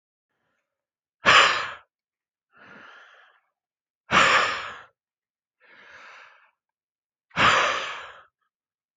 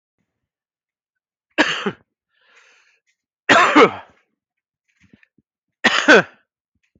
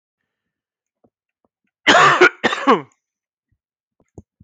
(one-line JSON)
{"exhalation_length": "9.0 s", "exhalation_amplitude": 21833, "exhalation_signal_mean_std_ratio": 0.32, "three_cough_length": "7.0 s", "three_cough_amplitude": 29137, "three_cough_signal_mean_std_ratio": 0.29, "cough_length": "4.4 s", "cough_amplitude": 30163, "cough_signal_mean_std_ratio": 0.31, "survey_phase": "beta (2021-08-13 to 2022-03-07)", "age": "45-64", "gender": "Male", "wearing_mask": "No", "symptom_none": true, "smoker_status": "Never smoked", "respiratory_condition_asthma": true, "respiratory_condition_other": false, "recruitment_source": "REACT", "submission_delay": "1 day", "covid_test_result": "Negative", "covid_test_method": "RT-qPCR", "influenza_a_test_result": "Unknown/Void", "influenza_b_test_result": "Unknown/Void"}